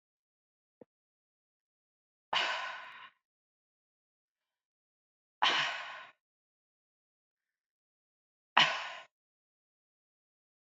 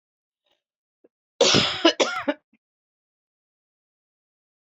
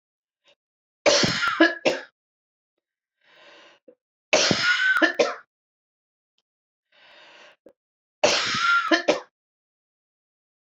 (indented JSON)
{
  "exhalation_length": "10.7 s",
  "exhalation_amplitude": 13359,
  "exhalation_signal_mean_std_ratio": 0.24,
  "cough_length": "4.6 s",
  "cough_amplitude": 23296,
  "cough_signal_mean_std_ratio": 0.29,
  "three_cough_length": "10.8 s",
  "three_cough_amplitude": 22750,
  "three_cough_signal_mean_std_ratio": 0.39,
  "survey_phase": "beta (2021-08-13 to 2022-03-07)",
  "age": "45-64",
  "gender": "Female",
  "wearing_mask": "No",
  "symptom_cough_any": true,
  "symptom_runny_or_blocked_nose": true,
  "symptom_sore_throat": true,
  "symptom_fatigue": true,
  "symptom_onset": "4 days",
  "smoker_status": "Never smoked",
  "respiratory_condition_asthma": false,
  "respiratory_condition_other": false,
  "recruitment_source": "Test and Trace",
  "submission_delay": "0 days",
  "covid_test_result": "Positive",
  "covid_test_method": "RT-qPCR",
  "covid_ct_value": 19.8,
  "covid_ct_gene": "ORF1ab gene",
  "covid_ct_mean": 20.1,
  "covid_viral_load": "250000 copies/ml",
  "covid_viral_load_category": "Low viral load (10K-1M copies/ml)"
}